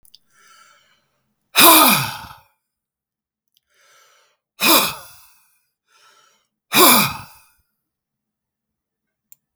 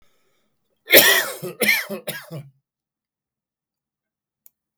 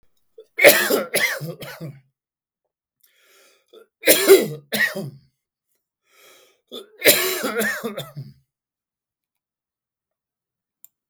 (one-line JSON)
{"exhalation_length": "9.6 s", "exhalation_amplitude": 32768, "exhalation_signal_mean_std_ratio": 0.29, "cough_length": "4.8 s", "cough_amplitude": 32768, "cough_signal_mean_std_ratio": 0.29, "three_cough_length": "11.1 s", "three_cough_amplitude": 32768, "three_cough_signal_mean_std_ratio": 0.32, "survey_phase": "beta (2021-08-13 to 2022-03-07)", "age": "65+", "gender": "Male", "wearing_mask": "No", "symptom_none": true, "smoker_status": "Never smoked", "respiratory_condition_asthma": false, "respiratory_condition_other": false, "recruitment_source": "REACT", "submission_delay": "0 days", "covid_test_result": "Negative", "covid_test_method": "RT-qPCR", "influenza_a_test_result": "Negative", "influenza_b_test_result": "Negative"}